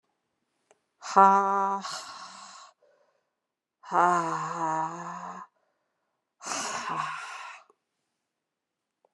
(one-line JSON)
{"exhalation_length": "9.1 s", "exhalation_amplitude": 19012, "exhalation_signal_mean_std_ratio": 0.36, "survey_phase": "beta (2021-08-13 to 2022-03-07)", "age": "45-64", "gender": "Female", "wearing_mask": "No", "symptom_cough_any": true, "symptom_runny_or_blocked_nose": true, "symptom_shortness_of_breath": true, "symptom_fatigue": true, "symptom_headache": true, "symptom_change_to_sense_of_smell_or_taste": true, "symptom_loss_of_taste": true, "symptom_onset": "4 days", "smoker_status": "Never smoked", "respiratory_condition_asthma": false, "respiratory_condition_other": false, "recruitment_source": "Test and Trace", "submission_delay": "1 day", "covid_test_result": "Positive", "covid_test_method": "RT-qPCR", "covid_ct_value": 25.1, "covid_ct_gene": "ORF1ab gene"}